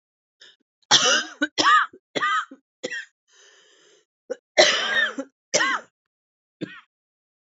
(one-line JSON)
{"cough_length": "7.4 s", "cough_amplitude": 27507, "cough_signal_mean_std_ratio": 0.4, "survey_phase": "beta (2021-08-13 to 2022-03-07)", "age": "18-44", "gender": "Female", "wearing_mask": "No", "symptom_cough_any": true, "symptom_sore_throat": true, "symptom_diarrhoea": true, "symptom_fatigue": true, "symptom_fever_high_temperature": true, "symptom_onset": "2 days", "smoker_status": "Ex-smoker", "respiratory_condition_asthma": false, "respiratory_condition_other": false, "recruitment_source": "Test and Trace", "submission_delay": "1 day", "covid_test_result": "Negative", "covid_test_method": "RT-qPCR"}